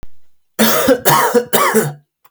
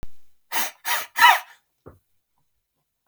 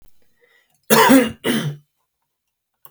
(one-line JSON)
{"three_cough_length": "2.3 s", "three_cough_amplitude": 32768, "three_cough_signal_mean_std_ratio": 0.68, "exhalation_length": "3.1 s", "exhalation_amplitude": 29342, "exhalation_signal_mean_std_ratio": 0.34, "cough_length": "2.9 s", "cough_amplitude": 32768, "cough_signal_mean_std_ratio": 0.37, "survey_phase": "beta (2021-08-13 to 2022-03-07)", "age": "18-44", "gender": "Male", "wearing_mask": "No", "symptom_none": true, "smoker_status": "Never smoked", "respiratory_condition_asthma": false, "respiratory_condition_other": false, "recruitment_source": "REACT", "submission_delay": "3 days", "covid_test_result": "Negative", "covid_test_method": "RT-qPCR", "influenza_a_test_result": "Negative", "influenza_b_test_result": "Negative"}